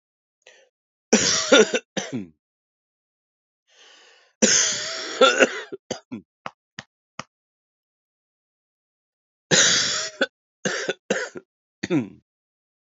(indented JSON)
{
  "three_cough_length": "13.0 s",
  "three_cough_amplitude": 32743,
  "three_cough_signal_mean_std_ratio": 0.35,
  "survey_phase": "alpha (2021-03-01 to 2021-08-12)",
  "age": "45-64",
  "gender": "Female",
  "wearing_mask": "No",
  "symptom_cough_any": true,
  "symptom_fatigue": true,
  "symptom_fever_high_temperature": true,
  "symptom_headache": true,
  "symptom_change_to_sense_of_smell_or_taste": true,
  "symptom_loss_of_taste": true,
  "symptom_onset": "3 days",
  "smoker_status": "Never smoked",
  "respiratory_condition_asthma": false,
  "respiratory_condition_other": false,
  "recruitment_source": "Test and Trace",
  "submission_delay": "2 days",
  "covid_test_result": "Positive",
  "covid_test_method": "RT-qPCR"
}